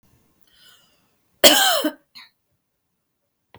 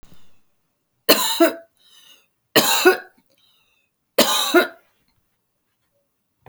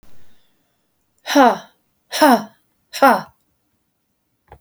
{"cough_length": "3.6 s", "cough_amplitude": 32768, "cough_signal_mean_std_ratio": 0.27, "three_cough_length": "6.5 s", "three_cough_amplitude": 32768, "three_cough_signal_mean_std_ratio": 0.34, "exhalation_length": "4.6 s", "exhalation_amplitude": 32261, "exhalation_signal_mean_std_ratio": 0.33, "survey_phase": "alpha (2021-03-01 to 2021-08-12)", "age": "45-64", "gender": "Female", "wearing_mask": "No", "symptom_none": true, "smoker_status": "Ex-smoker", "respiratory_condition_asthma": false, "respiratory_condition_other": false, "recruitment_source": "REACT", "submission_delay": "1 day", "covid_test_result": "Negative", "covid_test_method": "RT-qPCR"}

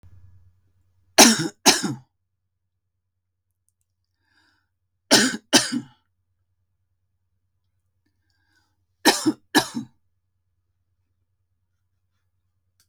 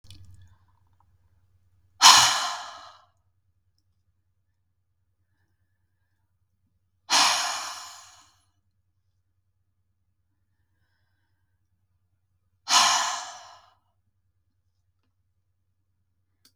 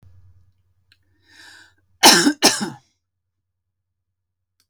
{"three_cough_length": "12.9 s", "three_cough_amplitude": 32768, "three_cough_signal_mean_std_ratio": 0.23, "exhalation_length": "16.6 s", "exhalation_amplitude": 32768, "exhalation_signal_mean_std_ratio": 0.23, "cough_length": "4.7 s", "cough_amplitude": 32768, "cough_signal_mean_std_ratio": 0.25, "survey_phase": "beta (2021-08-13 to 2022-03-07)", "age": "65+", "gender": "Female", "wearing_mask": "No", "symptom_none": true, "smoker_status": "Ex-smoker", "respiratory_condition_asthma": false, "respiratory_condition_other": false, "recruitment_source": "REACT", "submission_delay": "2 days", "covid_test_result": "Negative", "covid_test_method": "RT-qPCR", "influenza_a_test_result": "Negative", "influenza_b_test_result": "Negative"}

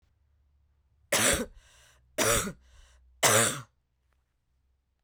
{"three_cough_length": "5.0 s", "three_cough_amplitude": 13117, "three_cough_signal_mean_std_ratio": 0.36, "survey_phase": "beta (2021-08-13 to 2022-03-07)", "age": "45-64", "gender": "Female", "wearing_mask": "No", "symptom_none": true, "symptom_onset": "3 days", "smoker_status": "Never smoked", "respiratory_condition_asthma": false, "respiratory_condition_other": false, "recruitment_source": "REACT", "submission_delay": "2 days", "covid_test_result": "Negative", "covid_test_method": "RT-qPCR", "influenza_a_test_result": "Negative", "influenza_b_test_result": "Negative"}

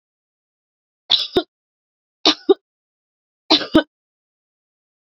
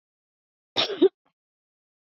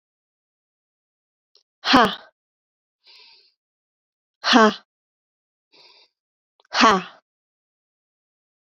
{"three_cough_length": "5.1 s", "three_cough_amplitude": 32229, "three_cough_signal_mean_std_ratio": 0.23, "cough_length": "2.0 s", "cough_amplitude": 11891, "cough_signal_mean_std_ratio": 0.24, "exhalation_length": "8.7 s", "exhalation_amplitude": 32371, "exhalation_signal_mean_std_ratio": 0.22, "survey_phase": "beta (2021-08-13 to 2022-03-07)", "age": "18-44", "gender": "Female", "wearing_mask": "No", "symptom_cough_any": true, "symptom_onset": "2 days", "smoker_status": "Never smoked", "respiratory_condition_asthma": false, "respiratory_condition_other": false, "recruitment_source": "Test and Trace", "submission_delay": "1 day", "covid_test_result": "Positive", "covid_test_method": "RT-qPCR", "covid_ct_value": 32.7, "covid_ct_gene": "N gene"}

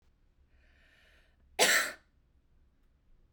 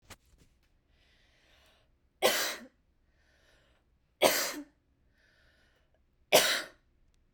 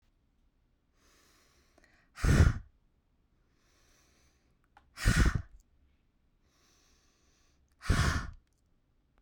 {"cough_length": "3.3 s", "cough_amplitude": 9535, "cough_signal_mean_std_ratio": 0.26, "three_cough_length": "7.3 s", "three_cough_amplitude": 14436, "three_cough_signal_mean_std_ratio": 0.27, "exhalation_length": "9.2 s", "exhalation_amplitude": 8345, "exhalation_signal_mean_std_ratio": 0.27, "survey_phase": "beta (2021-08-13 to 2022-03-07)", "age": "18-44", "gender": "Female", "wearing_mask": "No", "symptom_none": true, "smoker_status": "Never smoked", "respiratory_condition_asthma": false, "respiratory_condition_other": false, "recruitment_source": "REACT", "submission_delay": "1 day", "covid_test_result": "Negative", "covid_test_method": "RT-qPCR"}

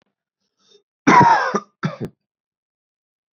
{"cough_length": "3.3 s", "cough_amplitude": 28616, "cough_signal_mean_std_ratio": 0.33, "survey_phase": "beta (2021-08-13 to 2022-03-07)", "age": "18-44", "gender": "Male", "wearing_mask": "No", "symptom_none": true, "smoker_status": "Never smoked", "respiratory_condition_asthma": false, "respiratory_condition_other": false, "recruitment_source": "REACT", "submission_delay": "2 days", "covid_test_result": "Negative", "covid_test_method": "RT-qPCR", "influenza_a_test_result": "Negative", "influenza_b_test_result": "Negative"}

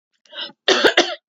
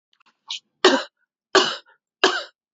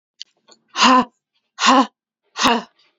{"cough_length": "1.3 s", "cough_amplitude": 30987, "cough_signal_mean_std_ratio": 0.45, "three_cough_length": "2.7 s", "three_cough_amplitude": 28308, "three_cough_signal_mean_std_ratio": 0.33, "exhalation_length": "3.0 s", "exhalation_amplitude": 30934, "exhalation_signal_mean_std_ratio": 0.39, "survey_phase": "beta (2021-08-13 to 2022-03-07)", "age": "18-44", "gender": "Female", "wearing_mask": "No", "symptom_none": true, "smoker_status": "Never smoked", "respiratory_condition_asthma": true, "respiratory_condition_other": false, "recruitment_source": "REACT", "submission_delay": "3 days", "covid_test_result": "Positive", "covid_test_method": "RT-qPCR", "covid_ct_value": 31.4, "covid_ct_gene": "E gene", "influenza_a_test_result": "Negative", "influenza_b_test_result": "Negative"}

